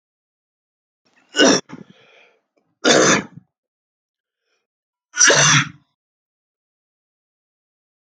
{"three_cough_length": "8.0 s", "three_cough_amplitude": 32767, "three_cough_signal_mean_std_ratio": 0.3, "survey_phase": "alpha (2021-03-01 to 2021-08-12)", "age": "18-44", "gender": "Male", "wearing_mask": "No", "symptom_none": true, "smoker_status": "Never smoked", "respiratory_condition_asthma": false, "respiratory_condition_other": false, "recruitment_source": "REACT", "submission_delay": "1 day", "covid_test_result": "Negative", "covid_test_method": "RT-qPCR"}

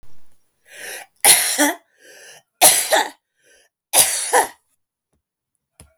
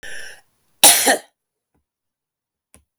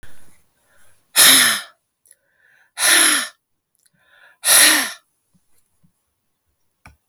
{"three_cough_length": "6.0 s", "three_cough_amplitude": 32768, "three_cough_signal_mean_std_ratio": 0.39, "cough_length": "3.0 s", "cough_amplitude": 32768, "cough_signal_mean_std_ratio": 0.28, "exhalation_length": "7.1 s", "exhalation_amplitude": 32768, "exhalation_signal_mean_std_ratio": 0.36, "survey_phase": "beta (2021-08-13 to 2022-03-07)", "age": "45-64", "gender": "Female", "wearing_mask": "No", "symptom_none": true, "smoker_status": "Ex-smoker", "respiratory_condition_asthma": false, "respiratory_condition_other": false, "recruitment_source": "REACT", "submission_delay": "0 days", "covid_test_result": "Negative", "covid_test_method": "RT-qPCR", "influenza_a_test_result": "Negative", "influenza_b_test_result": "Negative"}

